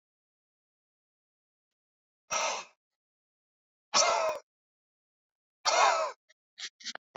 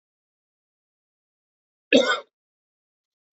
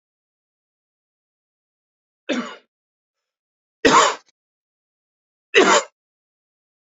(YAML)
exhalation_length: 7.2 s
exhalation_amplitude: 8777
exhalation_signal_mean_std_ratio: 0.32
cough_length: 3.3 s
cough_amplitude: 21593
cough_signal_mean_std_ratio: 0.2
three_cough_length: 6.9 s
three_cough_amplitude: 28687
three_cough_signal_mean_std_ratio: 0.24
survey_phase: beta (2021-08-13 to 2022-03-07)
age: 45-64
gender: Male
wearing_mask: 'No'
symptom_cough_any: true
symptom_fatigue: true
symptom_onset: 3 days
smoker_status: Ex-smoker
respiratory_condition_asthma: false
respiratory_condition_other: false
recruitment_source: Test and Trace
submission_delay: 1 day
covid_test_result: Positive
covid_test_method: RT-qPCR
covid_ct_value: 19.0
covid_ct_gene: ORF1ab gene
covid_ct_mean: 19.3
covid_viral_load: 450000 copies/ml
covid_viral_load_category: Low viral load (10K-1M copies/ml)